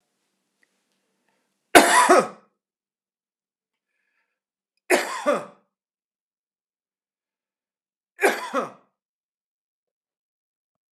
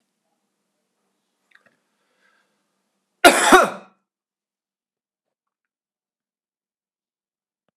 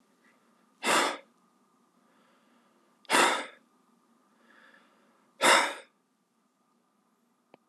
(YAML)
three_cough_length: 10.9 s
three_cough_amplitude: 32768
three_cough_signal_mean_std_ratio: 0.23
cough_length: 7.8 s
cough_amplitude: 32768
cough_signal_mean_std_ratio: 0.17
exhalation_length: 7.7 s
exhalation_amplitude: 14218
exhalation_signal_mean_std_ratio: 0.28
survey_phase: beta (2021-08-13 to 2022-03-07)
age: 45-64
gender: Male
wearing_mask: 'Yes'
symptom_none: true
smoker_status: Never smoked
respiratory_condition_asthma: false
respiratory_condition_other: false
recruitment_source: Test and Trace
submission_delay: 2 days
covid_test_result: Positive
covid_test_method: ePCR